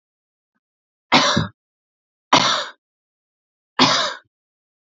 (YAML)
three_cough_length: 4.9 s
three_cough_amplitude: 30661
three_cough_signal_mean_std_ratio: 0.35
survey_phase: alpha (2021-03-01 to 2021-08-12)
age: 18-44
gender: Female
wearing_mask: 'No'
symptom_none: true
smoker_status: Current smoker (1 to 10 cigarettes per day)
respiratory_condition_asthma: false
respiratory_condition_other: false
recruitment_source: REACT
submission_delay: 2 days
covid_test_result: Negative
covid_test_method: RT-qPCR